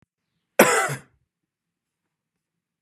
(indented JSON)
{
  "cough_length": "2.8 s",
  "cough_amplitude": 30905,
  "cough_signal_mean_std_ratio": 0.24,
  "survey_phase": "beta (2021-08-13 to 2022-03-07)",
  "age": "45-64",
  "gender": "Male",
  "wearing_mask": "No",
  "symptom_fatigue": true,
  "symptom_onset": "5 days",
  "smoker_status": "Never smoked",
  "respiratory_condition_asthma": false,
  "respiratory_condition_other": false,
  "recruitment_source": "REACT",
  "submission_delay": "0 days",
  "covid_test_result": "Negative",
  "covid_test_method": "RT-qPCR",
  "influenza_a_test_result": "Negative",
  "influenza_b_test_result": "Negative"
}